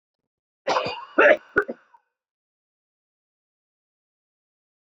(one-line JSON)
{"cough_length": "4.9 s", "cough_amplitude": 20307, "cough_signal_mean_std_ratio": 0.24, "survey_phase": "beta (2021-08-13 to 2022-03-07)", "age": "18-44", "gender": "Male", "wearing_mask": "No", "symptom_cough_any": true, "symptom_new_continuous_cough": true, "symptom_fatigue": true, "symptom_headache": true, "smoker_status": "Ex-smoker", "respiratory_condition_asthma": false, "respiratory_condition_other": false, "recruitment_source": "Test and Trace", "submission_delay": "1 day", "covid_test_result": "Positive", "covid_test_method": "ePCR"}